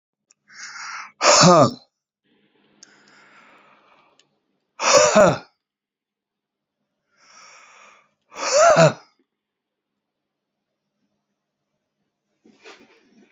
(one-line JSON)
{"exhalation_length": "13.3 s", "exhalation_amplitude": 32463, "exhalation_signal_mean_std_ratio": 0.28, "survey_phase": "beta (2021-08-13 to 2022-03-07)", "age": "45-64", "gender": "Male", "wearing_mask": "No", "symptom_none": true, "symptom_onset": "5 days", "smoker_status": "Ex-smoker", "respiratory_condition_asthma": false, "respiratory_condition_other": false, "recruitment_source": "REACT", "submission_delay": "1 day", "covid_test_result": "Negative", "covid_test_method": "RT-qPCR", "influenza_a_test_result": "Negative", "influenza_b_test_result": "Negative"}